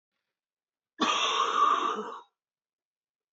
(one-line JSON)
{"cough_length": "3.3 s", "cough_amplitude": 6953, "cough_signal_mean_std_ratio": 0.48, "survey_phase": "beta (2021-08-13 to 2022-03-07)", "age": "45-64", "gender": "Female", "wearing_mask": "No", "symptom_cough_any": true, "symptom_runny_or_blocked_nose": true, "smoker_status": "Never smoked", "respiratory_condition_asthma": false, "respiratory_condition_other": false, "recruitment_source": "Test and Trace", "submission_delay": "1 day", "covid_test_result": "Positive", "covid_test_method": "RT-qPCR", "covid_ct_value": 12.8, "covid_ct_gene": "ORF1ab gene", "covid_ct_mean": 13.3, "covid_viral_load": "44000000 copies/ml", "covid_viral_load_category": "High viral load (>1M copies/ml)"}